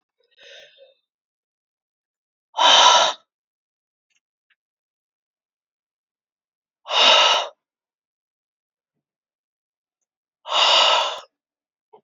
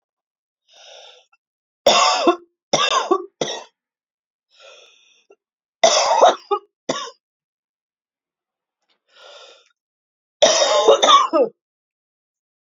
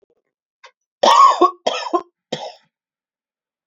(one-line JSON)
{"exhalation_length": "12.0 s", "exhalation_amplitude": 30737, "exhalation_signal_mean_std_ratio": 0.3, "three_cough_length": "12.8 s", "three_cough_amplitude": 32767, "three_cough_signal_mean_std_ratio": 0.36, "cough_length": "3.7 s", "cough_amplitude": 28736, "cough_signal_mean_std_ratio": 0.34, "survey_phase": "beta (2021-08-13 to 2022-03-07)", "age": "18-44", "gender": "Female", "wearing_mask": "No", "symptom_runny_or_blocked_nose": true, "symptom_sore_throat": true, "symptom_fever_high_temperature": true, "symptom_headache": true, "smoker_status": "Ex-smoker", "respiratory_condition_asthma": false, "respiratory_condition_other": false, "recruitment_source": "Test and Trace", "submission_delay": "1 day", "covid_test_result": "Negative", "covid_test_method": "RT-qPCR"}